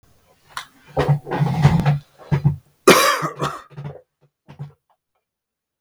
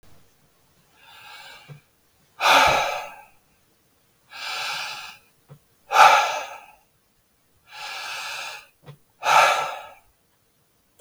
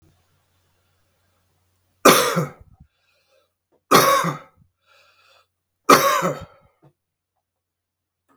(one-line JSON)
{"cough_length": "5.8 s", "cough_amplitude": 32768, "cough_signal_mean_std_ratio": 0.43, "exhalation_length": "11.0 s", "exhalation_amplitude": 32584, "exhalation_signal_mean_std_ratio": 0.35, "three_cough_length": "8.4 s", "three_cough_amplitude": 32768, "three_cough_signal_mean_std_ratio": 0.29, "survey_phase": "beta (2021-08-13 to 2022-03-07)", "age": "45-64", "gender": "Male", "wearing_mask": "No", "symptom_cough_any": true, "symptom_runny_or_blocked_nose": true, "symptom_fatigue": true, "symptom_change_to_sense_of_smell_or_taste": true, "symptom_loss_of_taste": true, "smoker_status": "Never smoked", "respiratory_condition_asthma": false, "respiratory_condition_other": false, "recruitment_source": "Test and Trace", "submission_delay": "2 days", "covid_test_result": "Positive", "covid_test_method": "LFT"}